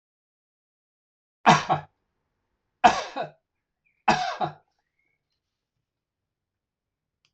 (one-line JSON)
{"three_cough_length": "7.3 s", "three_cough_amplitude": 23412, "three_cough_signal_mean_std_ratio": 0.23, "survey_phase": "alpha (2021-03-01 to 2021-08-12)", "age": "45-64", "gender": "Male", "wearing_mask": "No", "symptom_none": true, "smoker_status": "Never smoked", "respiratory_condition_asthma": false, "respiratory_condition_other": false, "recruitment_source": "REACT", "submission_delay": "2 days", "covid_test_result": "Negative", "covid_test_method": "RT-qPCR"}